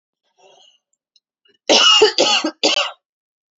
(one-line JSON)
{"cough_length": "3.6 s", "cough_amplitude": 32580, "cough_signal_mean_std_ratio": 0.42, "survey_phase": "beta (2021-08-13 to 2022-03-07)", "age": "18-44", "gender": "Female", "wearing_mask": "No", "symptom_fatigue": true, "symptom_onset": "12 days", "smoker_status": "Never smoked", "respiratory_condition_asthma": false, "respiratory_condition_other": false, "recruitment_source": "REACT", "submission_delay": "1 day", "covid_test_result": "Negative", "covid_test_method": "RT-qPCR", "influenza_a_test_result": "Negative", "influenza_b_test_result": "Negative"}